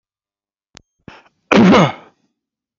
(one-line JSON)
{"cough_length": "2.8 s", "cough_amplitude": 32768, "cough_signal_mean_std_ratio": 0.32, "survey_phase": "beta (2021-08-13 to 2022-03-07)", "age": "45-64", "gender": "Male", "wearing_mask": "No", "symptom_none": true, "smoker_status": "Never smoked", "respiratory_condition_asthma": true, "respiratory_condition_other": false, "recruitment_source": "REACT", "submission_delay": "1 day", "covid_test_result": "Negative", "covid_test_method": "RT-qPCR"}